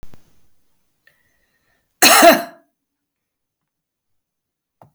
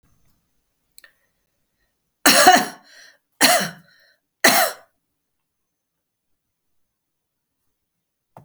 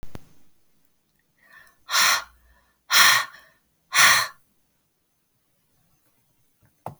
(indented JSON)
{
  "cough_length": "4.9 s",
  "cough_amplitude": 32768,
  "cough_signal_mean_std_ratio": 0.24,
  "three_cough_length": "8.4 s",
  "three_cough_amplitude": 32768,
  "three_cough_signal_mean_std_ratio": 0.26,
  "exhalation_length": "7.0 s",
  "exhalation_amplitude": 29096,
  "exhalation_signal_mean_std_ratio": 0.31,
  "survey_phase": "beta (2021-08-13 to 2022-03-07)",
  "age": "45-64",
  "gender": "Female",
  "wearing_mask": "No",
  "symptom_runny_or_blocked_nose": true,
  "smoker_status": "Never smoked",
  "respiratory_condition_asthma": false,
  "respiratory_condition_other": false,
  "recruitment_source": "REACT",
  "submission_delay": "2 days",
  "covid_test_result": "Negative",
  "covid_test_method": "RT-qPCR"
}